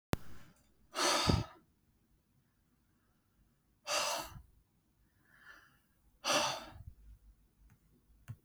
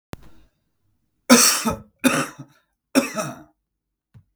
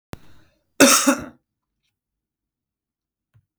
{
  "exhalation_length": "8.4 s",
  "exhalation_amplitude": 7275,
  "exhalation_signal_mean_std_ratio": 0.35,
  "three_cough_length": "4.4 s",
  "three_cough_amplitude": 32768,
  "three_cough_signal_mean_std_ratio": 0.34,
  "cough_length": "3.6 s",
  "cough_amplitude": 32768,
  "cough_signal_mean_std_ratio": 0.25,
  "survey_phase": "beta (2021-08-13 to 2022-03-07)",
  "age": "45-64",
  "gender": "Male",
  "wearing_mask": "No",
  "symptom_none": true,
  "smoker_status": "Current smoker (1 to 10 cigarettes per day)",
  "respiratory_condition_asthma": false,
  "respiratory_condition_other": false,
  "recruitment_source": "REACT",
  "submission_delay": "4 days",
  "covid_test_result": "Negative",
  "covid_test_method": "RT-qPCR",
  "influenza_a_test_result": "Negative",
  "influenza_b_test_result": "Negative"
}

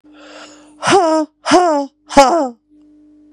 {
  "exhalation_length": "3.3 s",
  "exhalation_amplitude": 32768,
  "exhalation_signal_mean_std_ratio": 0.5,
  "survey_phase": "beta (2021-08-13 to 2022-03-07)",
  "age": "18-44",
  "gender": "Female",
  "wearing_mask": "No",
  "symptom_cough_any": true,
  "symptom_runny_or_blocked_nose": true,
  "symptom_sore_throat": true,
  "symptom_abdominal_pain": true,
  "symptom_diarrhoea": true,
  "symptom_fatigue": true,
  "symptom_headache": true,
  "smoker_status": "Ex-smoker",
  "respiratory_condition_asthma": true,
  "respiratory_condition_other": false,
  "recruitment_source": "Test and Trace",
  "submission_delay": "1 day",
  "covid_test_result": "Positive",
  "covid_test_method": "RT-qPCR",
  "covid_ct_value": 15.2,
  "covid_ct_gene": "ORF1ab gene"
}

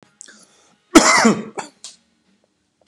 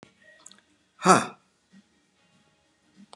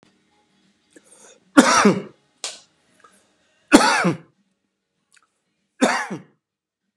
{
  "cough_length": "2.9 s",
  "cough_amplitude": 32768,
  "cough_signal_mean_std_ratio": 0.32,
  "exhalation_length": "3.2 s",
  "exhalation_amplitude": 29082,
  "exhalation_signal_mean_std_ratio": 0.19,
  "three_cough_length": "7.0 s",
  "three_cough_amplitude": 32768,
  "three_cough_signal_mean_std_ratio": 0.3,
  "survey_phase": "beta (2021-08-13 to 2022-03-07)",
  "age": "65+",
  "gender": "Male",
  "wearing_mask": "No",
  "symptom_cough_any": true,
  "smoker_status": "Never smoked",
  "respiratory_condition_asthma": false,
  "respiratory_condition_other": false,
  "recruitment_source": "REACT",
  "submission_delay": "2 days",
  "covid_test_result": "Negative",
  "covid_test_method": "RT-qPCR"
}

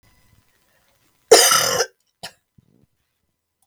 {
  "cough_length": "3.7 s",
  "cough_amplitude": 32768,
  "cough_signal_mean_std_ratio": 0.28,
  "survey_phase": "beta (2021-08-13 to 2022-03-07)",
  "age": "45-64",
  "gender": "Female",
  "wearing_mask": "No",
  "symptom_cough_any": true,
  "symptom_new_continuous_cough": true,
  "symptom_runny_or_blocked_nose": true,
  "symptom_sore_throat": true,
  "symptom_fatigue": true,
  "symptom_fever_high_temperature": true,
  "symptom_headache": true,
  "symptom_onset": "2 days",
  "smoker_status": "Ex-smoker",
  "respiratory_condition_asthma": false,
  "respiratory_condition_other": false,
  "recruitment_source": "Test and Trace",
  "submission_delay": "1 day",
  "covid_test_result": "Positive",
  "covid_test_method": "RT-qPCR",
  "covid_ct_value": 19.0,
  "covid_ct_gene": "N gene",
  "covid_ct_mean": 19.3,
  "covid_viral_load": "460000 copies/ml",
  "covid_viral_load_category": "Low viral load (10K-1M copies/ml)"
}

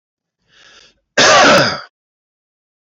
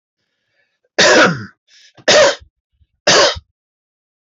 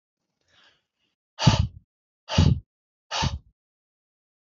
{
  "cough_length": "2.9 s",
  "cough_amplitude": 26606,
  "cough_signal_mean_std_ratio": 0.42,
  "three_cough_length": "4.4 s",
  "three_cough_amplitude": 27052,
  "three_cough_signal_mean_std_ratio": 0.42,
  "exhalation_length": "4.4 s",
  "exhalation_amplitude": 21871,
  "exhalation_signal_mean_std_ratio": 0.29,
  "survey_phase": "alpha (2021-03-01 to 2021-08-12)",
  "age": "45-64",
  "gender": "Male",
  "wearing_mask": "No",
  "symptom_none": true,
  "smoker_status": "Never smoked",
  "respiratory_condition_asthma": false,
  "respiratory_condition_other": false,
  "recruitment_source": "Test and Trace",
  "submission_delay": "2 days",
  "covid_test_result": "Positive",
  "covid_test_method": "RT-qPCR",
  "covid_ct_value": 24.9,
  "covid_ct_gene": "N gene"
}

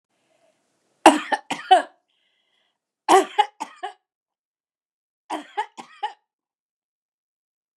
{
  "three_cough_length": "7.8 s",
  "three_cough_amplitude": 29204,
  "three_cough_signal_mean_std_ratio": 0.23,
  "survey_phase": "beta (2021-08-13 to 2022-03-07)",
  "age": "65+",
  "gender": "Female",
  "wearing_mask": "No",
  "symptom_none": true,
  "smoker_status": "Ex-smoker",
  "respiratory_condition_asthma": false,
  "respiratory_condition_other": false,
  "recruitment_source": "REACT",
  "submission_delay": "4 days",
  "covid_test_result": "Negative",
  "covid_test_method": "RT-qPCR",
  "influenza_a_test_result": "Negative",
  "influenza_b_test_result": "Negative"
}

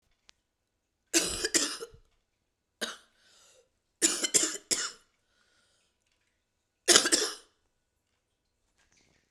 {
  "three_cough_length": "9.3 s",
  "three_cough_amplitude": 30789,
  "three_cough_signal_mean_std_ratio": 0.29,
  "survey_phase": "beta (2021-08-13 to 2022-03-07)",
  "age": "45-64",
  "gender": "Female",
  "wearing_mask": "No",
  "symptom_cough_any": true,
  "symptom_new_continuous_cough": true,
  "symptom_runny_or_blocked_nose": true,
  "symptom_shortness_of_breath": true,
  "symptom_sore_throat": true,
  "symptom_fatigue": true,
  "symptom_fever_high_temperature": true,
  "symptom_headache": true,
  "symptom_change_to_sense_of_smell_or_taste": true,
  "symptom_onset": "4 days",
  "smoker_status": "Never smoked",
  "respiratory_condition_asthma": true,
  "respiratory_condition_other": false,
  "recruitment_source": "Test and Trace",
  "submission_delay": "1 day",
  "covid_test_result": "Positive",
  "covid_test_method": "RT-qPCR",
  "covid_ct_value": 14.0,
  "covid_ct_gene": "ORF1ab gene",
  "covid_ct_mean": 14.3,
  "covid_viral_load": "20000000 copies/ml",
  "covid_viral_load_category": "High viral load (>1M copies/ml)"
}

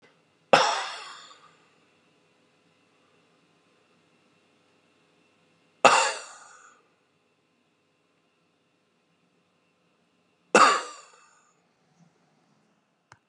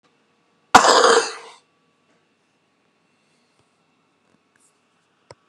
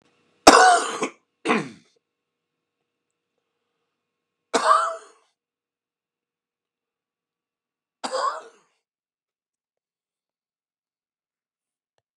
{
  "exhalation_length": "13.3 s",
  "exhalation_amplitude": 29637,
  "exhalation_signal_mean_std_ratio": 0.2,
  "cough_length": "5.5 s",
  "cough_amplitude": 32768,
  "cough_signal_mean_std_ratio": 0.24,
  "three_cough_length": "12.2 s",
  "three_cough_amplitude": 32768,
  "three_cough_signal_mean_std_ratio": 0.22,
  "survey_phase": "beta (2021-08-13 to 2022-03-07)",
  "age": "45-64",
  "gender": "Male",
  "wearing_mask": "No",
  "symptom_none": true,
  "smoker_status": "Ex-smoker",
  "respiratory_condition_asthma": false,
  "respiratory_condition_other": false,
  "recruitment_source": "REACT",
  "submission_delay": "2 days",
  "covid_test_result": "Negative",
  "covid_test_method": "RT-qPCR",
  "influenza_a_test_result": "Negative",
  "influenza_b_test_result": "Negative"
}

